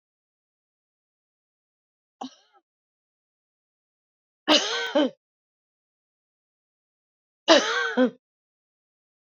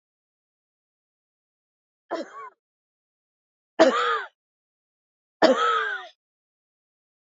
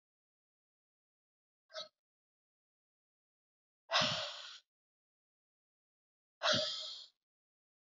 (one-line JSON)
{"cough_length": "9.3 s", "cough_amplitude": 27695, "cough_signal_mean_std_ratio": 0.24, "three_cough_length": "7.3 s", "three_cough_amplitude": 25145, "three_cough_signal_mean_std_ratio": 0.29, "exhalation_length": "7.9 s", "exhalation_amplitude": 3747, "exhalation_signal_mean_std_ratio": 0.27, "survey_phase": "beta (2021-08-13 to 2022-03-07)", "age": "65+", "gender": "Female", "wearing_mask": "No", "symptom_other": true, "symptom_onset": "12 days", "smoker_status": "Never smoked", "respiratory_condition_asthma": false, "respiratory_condition_other": false, "recruitment_source": "REACT", "submission_delay": "1 day", "covid_test_result": "Negative", "covid_test_method": "RT-qPCR", "influenza_a_test_result": "Negative", "influenza_b_test_result": "Negative"}